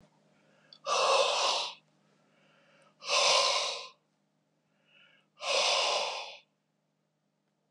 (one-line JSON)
{"exhalation_length": "7.7 s", "exhalation_amplitude": 8051, "exhalation_signal_mean_std_ratio": 0.47, "survey_phase": "beta (2021-08-13 to 2022-03-07)", "age": "65+", "gender": "Male", "wearing_mask": "No", "symptom_none": true, "smoker_status": "Ex-smoker", "respiratory_condition_asthma": false, "respiratory_condition_other": false, "recruitment_source": "REACT", "submission_delay": "1 day", "covid_test_result": "Negative", "covid_test_method": "RT-qPCR"}